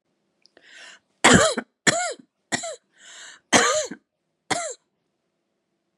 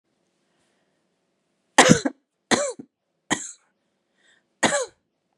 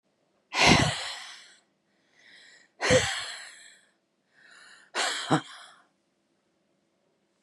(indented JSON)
{
  "cough_length": "6.0 s",
  "cough_amplitude": 30142,
  "cough_signal_mean_std_ratio": 0.33,
  "three_cough_length": "5.4 s",
  "three_cough_amplitude": 32732,
  "three_cough_signal_mean_std_ratio": 0.25,
  "exhalation_length": "7.4 s",
  "exhalation_amplitude": 16816,
  "exhalation_signal_mean_std_ratio": 0.33,
  "survey_phase": "beta (2021-08-13 to 2022-03-07)",
  "age": "45-64",
  "gender": "Female",
  "wearing_mask": "No",
  "symptom_new_continuous_cough": true,
  "symptom_abdominal_pain": true,
  "symptom_headache": true,
  "symptom_other": true,
  "symptom_onset": "4 days",
  "smoker_status": "Ex-smoker",
  "respiratory_condition_asthma": false,
  "respiratory_condition_other": false,
  "recruitment_source": "Test and Trace",
  "submission_delay": "1 day",
  "covid_test_result": "Positive",
  "covid_test_method": "RT-qPCR",
  "covid_ct_value": 27.7,
  "covid_ct_gene": "N gene",
  "covid_ct_mean": 27.9,
  "covid_viral_load": "690 copies/ml",
  "covid_viral_load_category": "Minimal viral load (< 10K copies/ml)"
}